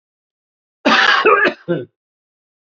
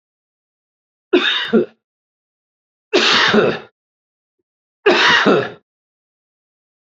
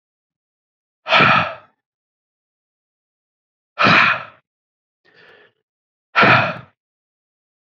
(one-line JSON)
{"cough_length": "2.7 s", "cough_amplitude": 29160, "cough_signal_mean_std_ratio": 0.45, "three_cough_length": "6.8 s", "three_cough_amplitude": 32768, "three_cough_signal_mean_std_ratio": 0.41, "exhalation_length": "7.8 s", "exhalation_amplitude": 31295, "exhalation_signal_mean_std_ratio": 0.31, "survey_phase": "beta (2021-08-13 to 2022-03-07)", "age": "65+", "gender": "Male", "wearing_mask": "No", "symptom_none": true, "smoker_status": "Never smoked", "respiratory_condition_asthma": false, "respiratory_condition_other": false, "recruitment_source": "REACT", "submission_delay": "2 days", "covid_test_result": "Negative", "covid_test_method": "RT-qPCR", "influenza_a_test_result": "Negative", "influenza_b_test_result": "Negative"}